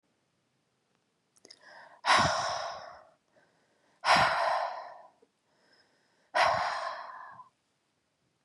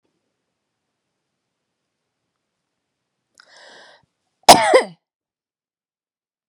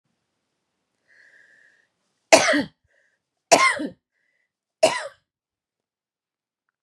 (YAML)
exhalation_length: 8.4 s
exhalation_amplitude: 10122
exhalation_signal_mean_std_ratio: 0.4
cough_length: 6.5 s
cough_amplitude: 32768
cough_signal_mean_std_ratio: 0.16
three_cough_length: 6.8 s
three_cough_amplitude: 32767
three_cough_signal_mean_std_ratio: 0.24
survey_phase: beta (2021-08-13 to 2022-03-07)
age: 18-44
gender: Female
wearing_mask: 'No'
symptom_runny_or_blocked_nose: true
symptom_onset: 3 days
smoker_status: Never smoked
respiratory_condition_asthma: false
respiratory_condition_other: false
recruitment_source: Test and Trace
submission_delay: 2 days
covid_test_result: Positive
covid_test_method: RT-qPCR
covid_ct_value: 21.4
covid_ct_gene: ORF1ab gene
covid_ct_mean: 21.9
covid_viral_load: 66000 copies/ml
covid_viral_load_category: Low viral load (10K-1M copies/ml)